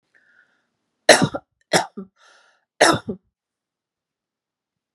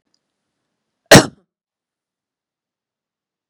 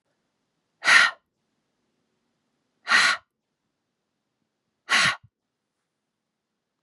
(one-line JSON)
{"three_cough_length": "4.9 s", "three_cough_amplitude": 32768, "three_cough_signal_mean_std_ratio": 0.23, "cough_length": "3.5 s", "cough_amplitude": 32768, "cough_signal_mean_std_ratio": 0.15, "exhalation_length": "6.8 s", "exhalation_amplitude": 27581, "exhalation_signal_mean_std_ratio": 0.26, "survey_phase": "beta (2021-08-13 to 2022-03-07)", "age": "45-64", "gender": "Female", "wearing_mask": "No", "symptom_runny_or_blocked_nose": true, "symptom_headache": true, "symptom_change_to_sense_of_smell_or_taste": true, "symptom_loss_of_taste": true, "smoker_status": "Never smoked", "respiratory_condition_asthma": false, "respiratory_condition_other": false, "recruitment_source": "Test and Trace", "submission_delay": "1 day", "covid_test_result": "Positive", "covid_test_method": "RT-qPCR", "covid_ct_value": 14.8, "covid_ct_gene": "ORF1ab gene", "covid_ct_mean": 15.1, "covid_viral_load": "11000000 copies/ml", "covid_viral_load_category": "High viral load (>1M copies/ml)"}